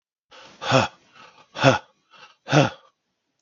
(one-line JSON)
{"exhalation_length": "3.4 s", "exhalation_amplitude": 32768, "exhalation_signal_mean_std_ratio": 0.32, "survey_phase": "beta (2021-08-13 to 2022-03-07)", "age": "45-64", "gender": "Male", "wearing_mask": "No", "symptom_cough_any": true, "symptom_runny_or_blocked_nose": true, "symptom_sore_throat": true, "symptom_onset": "3 days", "smoker_status": "Ex-smoker", "respiratory_condition_asthma": false, "respiratory_condition_other": false, "recruitment_source": "Test and Trace", "submission_delay": "1 day", "covid_test_result": "Positive", "covid_test_method": "ePCR"}